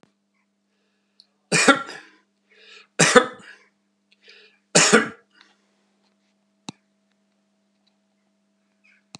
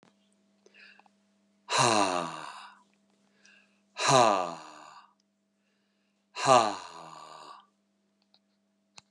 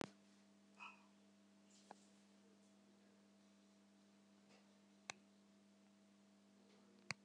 {
  "three_cough_length": "9.2 s",
  "three_cough_amplitude": 32767,
  "three_cough_signal_mean_std_ratio": 0.23,
  "exhalation_length": "9.1 s",
  "exhalation_amplitude": 16352,
  "exhalation_signal_mean_std_ratio": 0.31,
  "cough_length": "7.2 s",
  "cough_amplitude": 1774,
  "cough_signal_mean_std_ratio": 0.46,
  "survey_phase": "beta (2021-08-13 to 2022-03-07)",
  "age": "65+",
  "gender": "Male",
  "wearing_mask": "No",
  "symptom_none": true,
  "smoker_status": "Never smoked",
  "respiratory_condition_asthma": false,
  "respiratory_condition_other": false,
  "recruitment_source": "REACT",
  "submission_delay": "3 days",
  "covid_test_result": "Negative",
  "covid_test_method": "RT-qPCR"
}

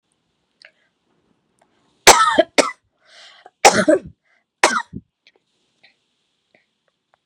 {
  "three_cough_length": "7.3 s",
  "three_cough_amplitude": 32768,
  "three_cough_signal_mean_std_ratio": 0.26,
  "survey_phase": "beta (2021-08-13 to 2022-03-07)",
  "age": "18-44",
  "gender": "Female",
  "wearing_mask": "No",
  "symptom_runny_or_blocked_nose": true,
  "symptom_fatigue": true,
  "smoker_status": "Never smoked",
  "respiratory_condition_asthma": false,
  "respiratory_condition_other": false,
  "recruitment_source": "Test and Trace",
  "submission_delay": "1 day",
  "covid_test_result": "Positive",
  "covid_test_method": "RT-qPCR",
  "covid_ct_value": 17.0,
  "covid_ct_gene": "ORF1ab gene",
  "covid_ct_mean": 17.2,
  "covid_viral_load": "2200000 copies/ml",
  "covid_viral_load_category": "High viral load (>1M copies/ml)"
}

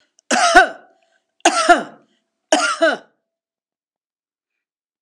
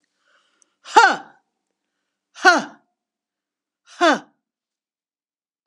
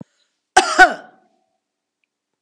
{
  "three_cough_length": "5.0 s",
  "three_cough_amplitude": 32768,
  "three_cough_signal_mean_std_ratio": 0.36,
  "exhalation_length": "5.7 s",
  "exhalation_amplitude": 32767,
  "exhalation_signal_mean_std_ratio": 0.24,
  "cough_length": "2.4 s",
  "cough_amplitude": 32768,
  "cough_signal_mean_std_ratio": 0.25,
  "survey_phase": "beta (2021-08-13 to 2022-03-07)",
  "age": "65+",
  "gender": "Female",
  "wearing_mask": "No",
  "symptom_headache": true,
  "smoker_status": "Ex-smoker",
  "respiratory_condition_asthma": true,
  "respiratory_condition_other": false,
  "recruitment_source": "REACT",
  "submission_delay": "1 day",
  "covid_test_result": "Negative",
  "covid_test_method": "RT-qPCR",
  "influenza_a_test_result": "Negative",
  "influenza_b_test_result": "Negative"
}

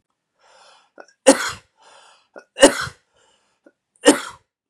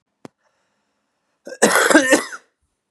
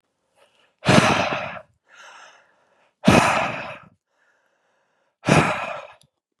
{
  "three_cough_length": "4.7 s",
  "three_cough_amplitude": 32768,
  "three_cough_signal_mean_std_ratio": 0.23,
  "cough_length": "2.9 s",
  "cough_amplitude": 32767,
  "cough_signal_mean_std_ratio": 0.36,
  "exhalation_length": "6.4 s",
  "exhalation_amplitude": 30576,
  "exhalation_signal_mean_std_ratio": 0.38,
  "survey_phase": "beta (2021-08-13 to 2022-03-07)",
  "age": "18-44",
  "gender": "Male",
  "wearing_mask": "No",
  "symptom_cough_any": true,
  "symptom_new_continuous_cough": true,
  "symptom_onset": "10 days",
  "smoker_status": "Ex-smoker",
  "respiratory_condition_asthma": false,
  "respiratory_condition_other": false,
  "recruitment_source": "REACT",
  "submission_delay": "6 days",
  "covid_test_result": "Negative",
  "covid_test_method": "RT-qPCR",
  "influenza_a_test_result": "Negative",
  "influenza_b_test_result": "Negative"
}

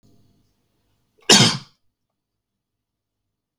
{
  "cough_length": "3.6 s",
  "cough_amplitude": 32768,
  "cough_signal_mean_std_ratio": 0.21,
  "survey_phase": "beta (2021-08-13 to 2022-03-07)",
  "age": "18-44",
  "gender": "Male",
  "wearing_mask": "No",
  "symptom_none": true,
  "symptom_onset": "12 days",
  "smoker_status": "Never smoked",
  "respiratory_condition_asthma": false,
  "respiratory_condition_other": false,
  "recruitment_source": "REACT",
  "submission_delay": "6 days",
  "covid_test_result": "Negative",
  "covid_test_method": "RT-qPCR"
}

